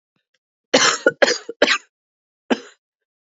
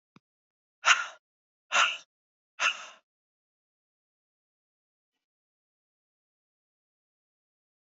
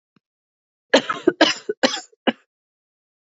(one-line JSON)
{"cough_length": "3.3 s", "cough_amplitude": 29969, "cough_signal_mean_std_ratio": 0.33, "exhalation_length": "7.9 s", "exhalation_amplitude": 15661, "exhalation_signal_mean_std_ratio": 0.2, "three_cough_length": "3.2 s", "three_cough_amplitude": 27470, "three_cough_signal_mean_std_ratio": 0.29, "survey_phase": "beta (2021-08-13 to 2022-03-07)", "age": "18-44", "gender": "Female", "wearing_mask": "No", "symptom_cough_any": true, "symptom_runny_or_blocked_nose": true, "symptom_shortness_of_breath": true, "symptom_sore_throat": true, "symptom_fatigue": true, "symptom_headache": true, "smoker_status": "Never smoked", "respiratory_condition_asthma": false, "respiratory_condition_other": false, "recruitment_source": "Test and Trace", "submission_delay": "2 days", "covid_test_result": "Positive", "covid_test_method": "RT-qPCR"}